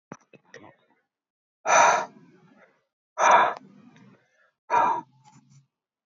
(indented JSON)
{
  "exhalation_length": "6.1 s",
  "exhalation_amplitude": 18407,
  "exhalation_signal_mean_std_ratio": 0.34,
  "survey_phase": "alpha (2021-03-01 to 2021-08-12)",
  "age": "18-44",
  "gender": "Male",
  "wearing_mask": "No",
  "symptom_none": true,
  "smoker_status": "Never smoked",
  "respiratory_condition_asthma": false,
  "respiratory_condition_other": false,
  "recruitment_source": "REACT",
  "submission_delay": "1 day",
  "covid_test_result": "Negative",
  "covid_test_method": "RT-qPCR"
}